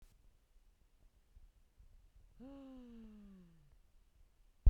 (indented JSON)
{
  "exhalation_length": "4.7 s",
  "exhalation_amplitude": 5671,
  "exhalation_signal_mean_std_ratio": 0.14,
  "survey_phase": "beta (2021-08-13 to 2022-03-07)",
  "age": "45-64",
  "gender": "Female",
  "wearing_mask": "No",
  "symptom_none": true,
  "smoker_status": "Never smoked",
  "respiratory_condition_asthma": false,
  "respiratory_condition_other": false,
  "recruitment_source": "REACT",
  "submission_delay": "1 day",
  "covid_test_result": "Negative",
  "covid_test_method": "RT-qPCR"
}